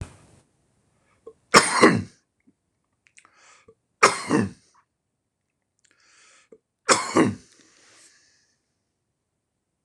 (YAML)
three_cough_length: 9.8 s
three_cough_amplitude: 26028
three_cough_signal_mean_std_ratio: 0.25
survey_phase: beta (2021-08-13 to 2022-03-07)
age: 65+
gender: Male
wearing_mask: 'No'
symptom_cough_any: true
symptom_runny_or_blocked_nose: true
symptom_headache: true
smoker_status: Ex-smoker
respiratory_condition_asthma: false
respiratory_condition_other: false
recruitment_source: Test and Trace
submission_delay: 1 day
covid_test_result: Positive
covid_test_method: LFT